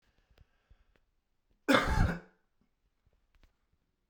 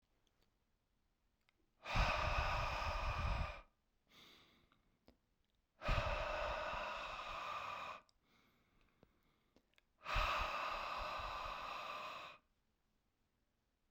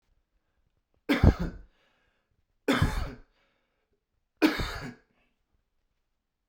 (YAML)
cough_length: 4.1 s
cough_amplitude: 11383
cough_signal_mean_std_ratio: 0.27
exhalation_length: 13.9 s
exhalation_amplitude: 2176
exhalation_signal_mean_std_ratio: 0.56
three_cough_length: 6.5 s
three_cough_amplitude: 18794
three_cough_signal_mean_std_ratio: 0.29
survey_phase: beta (2021-08-13 to 2022-03-07)
age: 18-44
gender: Male
wearing_mask: 'No'
symptom_cough_any: true
symptom_sore_throat: true
symptom_fatigue: true
symptom_other: true
symptom_onset: 4 days
smoker_status: Never smoked
respiratory_condition_asthma: false
respiratory_condition_other: false
recruitment_source: Test and Trace
submission_delay: 3 days
covid_test_result: Positive
covid_test_method: RT-qPCR
covid_ct_value: 19.1
covid_ct_gene: N gene
covid_ct_mean: 19.2
covid_viral_load: 510000 copies/ml
covid_viral_load_category: Low viral load (10K-1M copies/ml)